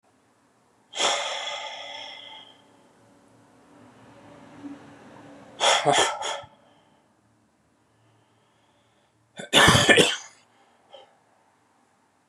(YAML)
exhalation_length: 12.3 s
exhalation_amplitude: 30109
exhalation_signal_mean_std_ratio: 0.32
survey_phase: beta (2021-08-13 to 2022-03-07)
age: 45-64
gender: Male
wearing_mask: 'No'
symptom_cough_any: true
symptom_runny_or_blocked_nose: true
symptom_sore_throat: true
symptom_fatigue: true
smoker_status: Never smoked
respiratory_condition_asthma: false
respiratory_condition_other: false
recruitment_source: REACT
submission_delay: 2 days
covid_test_result: Negative
covid_test_method: RT-qPCR
influenza_a_test_result: Unknown/Void
influenza_b_test_result: Unknown/Void